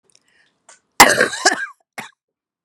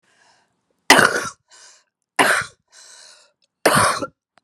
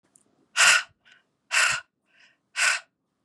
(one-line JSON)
{"cough_length": "2.6 s", "cough_amplitude": 32768, "cough_signal_mean_std_ratio": 0.3, "three_cough_length": "4.4 s", "three_cough_amplitude": 32768, "three_cough_signal_mean_std_ratio": 0.35, "exhalation_length": "3.2 s", "exhalation_amplitude": 19853, "exhalation_signal_mean_std_ratio": 0.38, "survey_phase": "beta (2021-08-13 to 2022-03-07)", "age": "45-64", "gender": "Female", "wearing_mask": "No", "symptom_cough_any": true, "symptom_runny_or_blocked_nose": true, "symptom_fatigue": true, "symptom_change_to_sense_of_smell_or_taste": true, "symptom_loss_of_taste": true, "smoker_status": "Ex-smoker", "respiratory_condition_asthma": false, "respiratory_condition_other": false, "recruitment_source": "Test and Trace", "submission_delay": "1 day", "covid_test_result": "Positive", "covid_test_method": "RT-qPCR", "covid_ct_value": 20.9, "covid_ct_gene": "ORF1ab gene"}